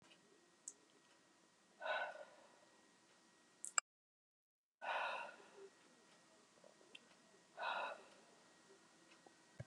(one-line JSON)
{"exhalation_length": "9.7 s", "exhalation_amplitude": 4599, "exhalation_signal_mean_std_ratio": 0.36, "survey_phase": "beta (2021-08-13 to 2022-03-07)", "age": "65+", "gender": "Female", "wearing_mask": "No", "symptom_none": true, "smoker_status": "Never smoked", "respiratory_condition_asthma": false, "respiratory_condition_other": false, "recruitment_source": "REACT", "submission_delay": "2 days", "covid_test_result": "Negative", "covid_test_method": "RT-qPCR", "influenza_a_test_result": "Negative", "influenza_b_test_result": "Negative"}